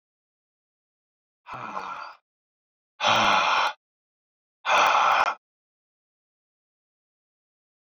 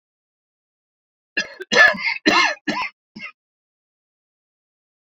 exhalation_length: 7.9 s
exhalation_amplitude: 14303
exhalation_signal_mean_std_ratio: 0.37
cough_length: 5.0 s
cough_amplitude: 28993
cough_signal_mean_std_ratio: 0.32
survey_phase: beta (2021-08-13 to 2022-03-07)
age: 45-64
gender: Male
wearing_mask: 'No'
symptom_runny_or_blocked_nose: true
symptom_fatigue: true
symptom_headache: true
smoker_status: Ex-smoker
respiratory_condition_asthma: false
respiratory_condition_other: false
recruitment_source: Test and Trace
submission_delay: 2 days
covid_test_result: Positive
covid_test_method: ePCR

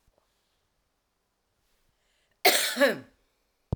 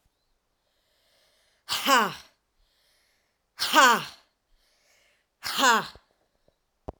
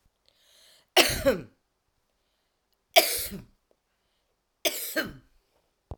cough_length: 3.8 s
cough_amplitude: 18251
cough_signal_mean_std_ratio: 0.27
exhalation_length: 7.0 s
exhalation_amplitude: 21298
exhalation_signal_mean_std_ratio: 0.3
three_cough_length: 6.0 s
three_cough_amplitude: 24687
three_cough_signal_mean_std_ratio: 0.28
survey_phase: alpha (2021-03-01 to 2021-08-12)
age: 45-64
gender: Female
wearing_mask: 'No'
symptom_cough_any: true
symptom_diarrhoea: true
symptom_fatigue: true
symptom_headache: true
smoker_status: Never smoked
respiratory_condition_asthma: true
respiratory_condition_other: false
recruitment_source: REACT
submission_delay: 1 day
covid_test_result: Negative
covid_test_method: RT-qPCR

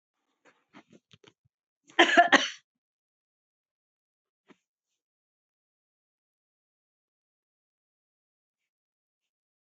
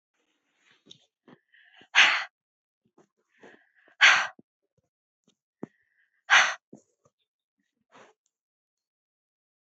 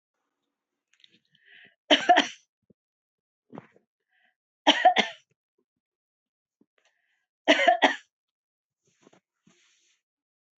cough_length: 9.7 s
cough_amplitude: 23858
cough_signal_mean_std_ratio: 0.14
exhalation_length: 9.6 s
exhalation_amplitude: 19240
exhalation_signal_mean_std_ratio: 0.21
three_cough_length: 10.6 s
three_cough_amplitude: 20747
three_cough_signal_mean_std_ratio: 0.23
survey_phase: beta (2021-08-13 to 2022-03-07)
age: 65+
gender: Female
wearing_mask: 'No'
symptom_none: true
smoker_status: Never smoked
respiratory_condition_asthma: false
respiratory_condition_other: false
recruitment_source: REACT
submission_delay: 2 days
covid_test_result: Negative
covid_test_method: RT-qPCR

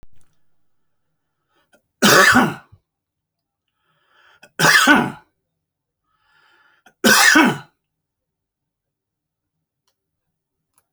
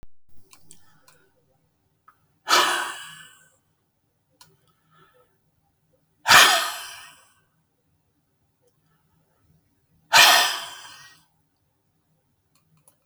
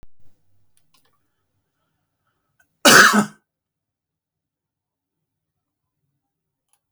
three_cough_length: 10.9 s
three_cough_amplitude: 32767
three_cough_signal_mean_std_ratio: 0.31
exhalation_length: 13.1 s
exhalation_amplitude: 30660
exhalation_signal_mean_std_ratio: 0.25
cough_length: 6.9 s
cough_amplitude: 32768
cough_signal_mean_std_ratio: 0.19
survey_phase: beta (2021-08-13 to 2022-03-07)
age: 65+
gender: Male
wearing_mask: 'No'
symptom_none: true
smoker_status: Ex-smoker
respiratory_condition_asthma: false
respiratory_condition_other: false
recruitment_source: REACT
submission_delay: 1 day
covid_test_result: Negative
covid_test_method: RT-qPCR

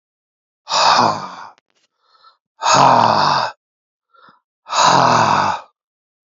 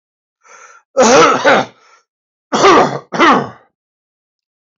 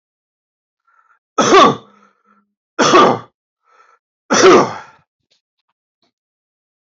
exhalation_length: 6.3 s
exhalation_amplitude: 31384
exhalation_signal_mean_std_ratio: 0.51
cough_length: 4.8 s
cough_amplitude: 31543
cough_signal_mean_std_ratio: 0.46
three_cough_length: 6.8 s
three_cough_amplitude: 32768
three_cough_signal_mean_std_ratio: 0.34
survey_phase: alpha (2021-03-01 to 2021-08-12)
age: 65+
gender: Male
wearing_mask: 'No'
symptom_none: true
smoker_status: Never smoked
respiratory_condition_asthma: false
respiratory_condition_other: false
recruitment_source: REACT
submission_delay: 33 days
covid_test_result: Negative
covid_test_method: RT-qPCR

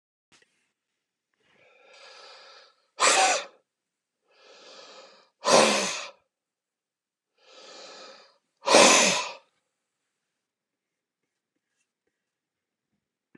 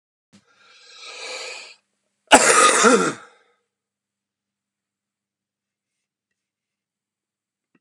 exhalation_length: 13.4 s
exhalation_amplitude: 25004
exhalation_signal_mean_std_ratio: 0.27
cough_length: 7.8 s
cough_amplitude: 32768
cough_signal_mean_std_ratio: 0.26
survey_phase: beta (2021-08-13 to 2022-03-07)
age: 65+
gender: Male
wearing_mask: 'No'
symptom_none: true
smoker_status: Never smoked
respiratory_condition_asthma: true
respiratory_condition_other: false
recruitment_source: REACT
submission_delay: 1 day
covid_test_result: Negative
covid_test_method: RT-qPCR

